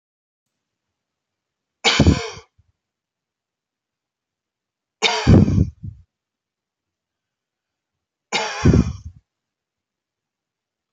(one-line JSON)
{"three_cough_length": "10.9 s", "three_cough_amplitude": 30478, "three_cough_signal_mean_std_ratio": 0.27, "survey_phase": "beta (2021-08-13 to 2022-03-07)", "age": "18-44", "gender": "Male", "wearing_mask": "No", "symptom_none": true, "smoker_status": "Never smoked", "respiratory_condition_asthma": false, "respiratory_condition_other": false, "recruitment_source": "REACT", "submission_delay": "1 day", "covid_test_result": "Negative", "covid_test_method": "RT-qPCR", "influenza_a_test_result": "Negative", "influenza_b_test_result": "Negative"}